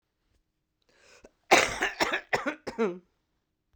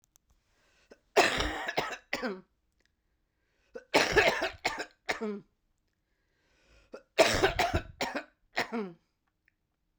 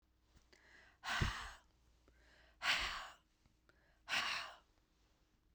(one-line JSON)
{"cough_length": "3.8 s", "cough_amplitude": 20032, "cough_signal_mean_std_ratio": 0.35, "three_cough_length": "10.0 s", "three_cough_amplitude": 13822, "three_cough_signal_mean_std_ratio": 0.38, "exhalation_length": "5.5 s", "exhalation_amplitude": 2408, "exhalation_signal_mean_std_ratio": 0.4, "survey_phase": "beta (2021-08-13 to 2022-03-07)", "age": "65+", "gender": "Female", "wearing_mask": "No", "symptom_cough_any": true, "symptom_runny_or_blocked_nose": true, "symptom_fatigue": true, "symptom_headache": true, "symptom_onset": "12 days", "smoker_status": "Never smoked", "respiratory_condition_asthma": true, "respiratory_condition_other": false, "recruitment_source": "REACT", "submission_delay": "2 days", "covid_test_result": "Negative", "covid_test_method": "RT-qPCR"}